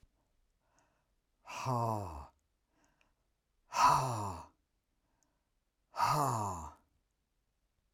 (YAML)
exhalation_length: 7.9 s
exhalation_amplitude: 5346
exhalation_signal_mean_std_ratio: 0.38
survey_phase: alpha (2021-03-01 to 2021-08-12)
age: 45-64
gender: Male
wearing_mask: 'No'
symptom_none: true
smoker_status: Never smoked
respiratory_condition_asthma: false
respiratory_condition_other: false
recruitment_source: REACT
submission_delay: 6 days
covid_test_result: Negative
covid_test_method: RT-qPCR